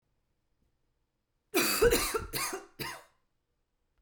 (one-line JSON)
{"cough_length": "4.0 s", "cough_amplitude": 8241, "cough_signal_mean_std_ratio": 0.39, "survey_phase": "beta (2021-08-13 to 2022-03-07)", "age": "45-64", "gender": "Female", "wearing_mask": "No", "symptom_none": true, "smoker_status": "Ex-smoker", "respiratory_condition_asthma": false, "respiratory_condition_other": false, "recruitment_source": "REACT", "submission_delay": "2 days", "covid_test_result": "Negative", "covid_test_method": "RT-qPCR"}